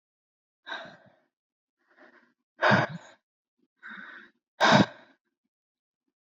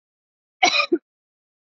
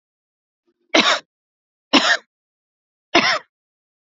{
  "exhalation_length": "6.2 s",
  "exhalation_amplitude": 14337,
  "exhalation_signal_mean_std_ratio": 0.26,
  "cough_length": "1.7 s",
  "cough_amplitude": 25911,
  "cough_signal_mean_std_ratio": 0.31,
  "three_cough_length": "4.2 s",
  "three_cough_amplitude": 32767,
  "three_cough_signal_mean_std_ratio": 0.31,
  "survey_phase": "beta (2021-08-13 to 2022-03-07)",
  "age": "18-44",
  "gender": "Female",
  "wearing_mask": "No",
  "symptom_none": true,
  "smoker_status": "Never smoked",
  "respiratory_condition_asthma": false,
  "respiratory_condition_other": false,
  "recruitment_source": "REACT",
  "submission_delay": "7 days",
  "covid_test_result": "Negative",
  "covid_test_method": "RT-qPCR"
}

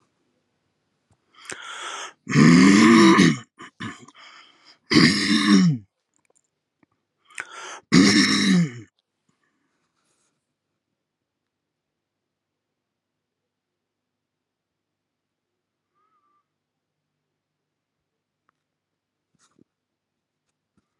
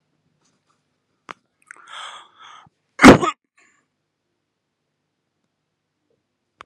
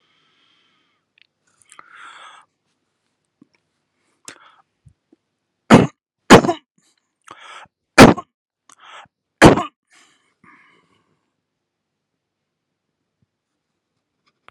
{
  "exhalation_length": "21.0 s",
  "exhalation_amplitude": 26525,
  "exhalation_signal_mean_std_ratio": 0.3,
  "cough_length": "6.7 s",
  "cough_amplitude": 32768,
  "cough_signal_mean_std_ratio": 0.15,
  "three_cough_length": "14.5 s",
  "three_cough_amplitude": 32768,
  "three_cough_signal_mean_std_ratio": 0.17,
  "survey_phase": "beta (2021-08-13 to 2022-03-07)",
  "age": "45-64",
  "gender": "Male",
  "wearing_mask": "No",
  "symptom_none": true,
  "smoker_status": "Never smoked",
  "respiratory_condition_asthma": false,
  "respiratory_condition_other": false,
  "recruitment_source": "REACT",
  "submission_delay": "3 days",
  "covid_test_result": "Negative",
  "covid_test_method": "RT-qPCR",
  "influenza_a_test_result": "Negative",
  "influenza_b_test_result": "Negative"
}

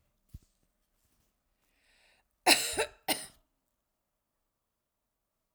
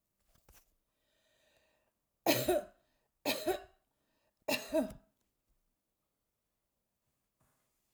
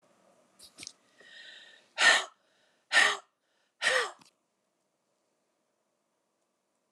{
  "cough_length": "5.5 s",
  "cough_amplitude": 12786,
  "cough_signal_mean_std_ratio": 0.2,
  "three_cough_length": "7.9 s",
  "three_cough_amplitude": 6695,
  "three_cough_signal_mean_std_ratio": 0.27,
  "exhalation_length": "6.9 s",
  "exhalation_amplitude": 11940,
  "exhalation_signal_mean_std_ratio": 0.26,
  "survey_phase": "alpha (2021-03-01 to 2021-08-12)",
  "age": "65+",
  "gender": "Female",
  "wearing_mask": "No",
  "symptom_none": true,
  "smoker_status": "Never smoked",
  "respiratory_condition_asthma": false,
  "respiratory_condition_other": false,
  "recruitment_source": "REACT",
  "submission_delay": "5 days",
  "covid_test_result": "Negative",
  "covid_test_method": "RT-qPCR"
}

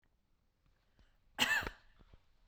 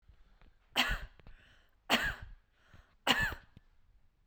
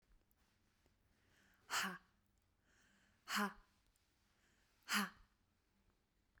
{
  "cough_length": "2.5 s",
  "cough_amplitude": 5145,
  "cough_signal_mean_std_ratio": 0.3,
  "three_cough_length": "4.3 s",
  "three_cough_amplitude": 10434,
  "three_cough_signal_mean_std_ratio": 0.37,
  "exhalation_length": "6.4 s",
  "exhalation_amplitude": 1723,
  "exhalation_signal_mean_std_ratio": 0.28,
  "survey_phase": "beta (2021-08-13 to 2022-03-07)",
  "age": "18-44",
  "gender": "Female",
  "wearing_mask": "No",
  "symptom_none": true,
  "smoker_status": "Never smoked",
  "respiratory_condition_asthma": false,
  "respiratory_condition_other": false,
  "recruitment_source": "REACT",
  "submission_delay": "9 days",
  "covid_test_result": "Negative",
  "covid_test_method": "RT-qPCR",
  "influenza_a_test_result": "Negative",
  "influenza_b_test_result": "Negative"
}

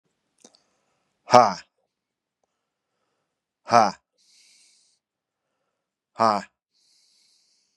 {
  "exhalation_length": "7.8 s",
  "exhalation_amplitude": 32768,
  "exhalation_signal_mean_std_ratio": 0.18,
  "survey_phase": "beta (2021-08-13 to 2022-03-07)",
  "age": "45-64",
  "gender": "Male",
  "wearing_mask": "No",
  "symptom_cough_any": true,
  "symptom_new_continuous_cough": true,
  "symptom_sore_throat": true,
  "symptom_fatigue": true,
  "symptom_other": true,
  "smoker_status": "Never smoked",
  "respiratory_condition_asthma": false,
  "respiratory_condition_other": false,
  "recruitment_source": "Test and Trace",
  "submission_delay": "1 day",
  "covid_test_result": "Positive",
  "covid_test_method": "LFT"
}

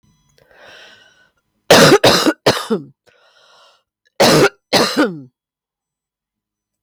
{
  "cough_length": "6.8 s",
  "cough_amplitude": 32768,
  "cough_signal_mean_std_ratio": 0.39,
  "survey_phase": "beta (2021-08-13 to 2022-03-07)",
  "age": "45-64",
  "gender": "Female",
  "wearing_mask": "No",
  "symptom_cough_any": true,
  "smoker_status": "Never smoked",
  "respiratory_condition_asthma": false,
  "respiratory_condition_other": false,
  "recruitment_source": "REACT",
  "submission_delay": "7 days",
  "covid_test_result": "Negative",
  "covid_test_method": "RT-qPCR"
}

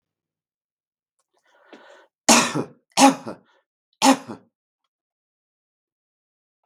{
  "three_cough_length": "6.7 s",
  "three_cough_amplitude": 32767,
  "three_cough_signal_mean_std_ratio": 0.23,
  "survey_phase": "beta (2021-08-13 to 2022-03-07)",
  "age": "65+",
  "gender": "Male",
  "wearing_mask": "No",
  "symptom_none": true,
  "smoker_status": "Ex-smoker",
  "respiratory_condition_asthma": false,
  "respiratory_condition_other": false,
  "recruitment_source": "REACT",
  "submission_delay": "7 days",
  "covid_test_result": "Negative",
  "covid_test_method": "RT-qPCR",
  "influenza_a_test_result": "Negative",
  "influenza_b_test_result": "Negative"
}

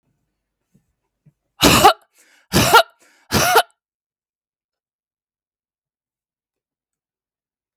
{
  "three_cough_length": "7.8 s",
  "three_cough_amplitude": 32768,
  "three_cough_signal_mean_std_ratio": 0.26,
  "survey_phase": "beta (2021-08-13 to 2022-03-07)",
  "age": "45-64",
  "gender": "Female",
  "wearing_mask": "No",
  "symptom_none": true,
  "smoker_status": "Ex-smoker",
  "respiratory_condition_asthma": false,
  "respiratory_condition_other": false,
  "recruitment_source": "REACT",
  "submission_delay": "1 day",
  "covid_test_result": "Negative",
  "covid_test_method": "RT-qPCR",
  "influenza_a_test_result": "Negative",
  "influenza_b_test_result": "Negative"
}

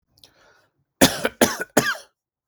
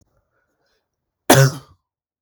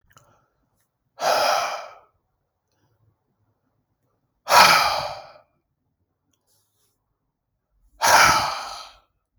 {
  "three_cough_length": "2.5 s",
  "three_cough_amplitude": 32768,
  "three_cough_signal_mean_std_ratio": 0.32,
  "cough_length": "2.2 s",
  "cough_amplitude": 32767,
  "cough_signal_mean_std_ratio": 0.25,
  "exhalation_length": "9.4 s",
  "exhalation_amplitude": 32767,
  "exhalation_signal_mean_std_ratio": 0.33,
  "survey_phase": "beta (2021-08-13 to 2022-03-07)",
  "age": "18-44",
  "gender": "Male",
  "wearing_mask": "No",
  "symptom_none": true,
  "smoker_status": "Never smoked",
  "respiratory_condition_asthma": false,
  "respiratory_condition_other": false,
  "recruitment_source": "REACT",
  "submission_delay": "1 day",
  "covid_test_result": "Negative",
  "covid_test_method": "RT-qPCR"
}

